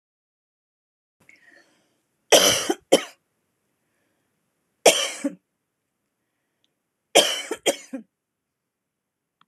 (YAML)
three_cough_length: 9.5 s
three_cough_amplitude: 26209
three_cough_signal_mean_std_ratio: 0.24
survey_phase: alpha (2021-03-01 to 2021-08-12)
age: 45-64
gender: Female
wearing_mask: 'No'
symptom_none: true
smoker_status: Never smoked
respiratory_condition_asthma: false
respiratory_condition_other: false
recruitment_source: REACT
submission_delay: 3 days
covid_test_result: Negative
covid_test_method: RT-qPCR